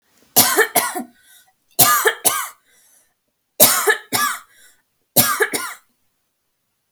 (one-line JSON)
{"three_cough_length": "6.9 s", "three_cough_amplitude": 32768, "three_cough_signal_mean_std_ratio": 0.42, "survey_phase": "alpha (2021-03-01 to 2021-08-12)", "age": "18-44", "gender": "Female", "wearing_mask": "No", "symptom_none": true, "symptom_onset": "6 days", "smoker_status": "Never smoked", "respiratory_condition_asthma": false, "respiratory_condition_other": false, "recruitment_source": "REACT", "submission_delay": "2 days", "covid_test_result": "Negative", "covid_test_method": "RT-qPCR"}